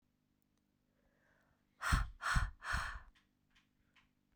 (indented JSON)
{
  "exhalation_length": "4.4 s",
  "exhalation_amplitude": 4013,
  "exhalation_signal_mean_std_ratio": 0.34,
  "survey_phase": "beta (2021-08-13 to 2022-03-07)",
  "age": "18-44",
  "gender": "Female",
  "wearing_mask": "No",
  "symptom_cough_any": true,
  "symptom_new_continuous_cough": true,
  "symptom_runny_or_blocked_nose": true,
  "symptom_shortness_of_breath": true,
  "symptom_fatigue": true,
  "symptom_headache": true,
  "symptom_onset": "2 days",
  "smoker_status": "Never smoked",
  "respiratory_condition_asthma": false,
  "respiratory_condition_other": false,
  "recruitment_source": "Test and Trace",
  "submission_delay": "2 days",
  "covid_test_result": "Positive",
  "covid_test_method": "RT-qPCR",
  "covid_ct_value": 27.4,
  "covid_ct_gene": "ORF1ab gene",
  "covid_ct_mean": 28.0,
  "covid_viral_load": "670 copies/ml",
  "covid_viral_load_category": "Minimal viral load (< 10K copies/ml)"
}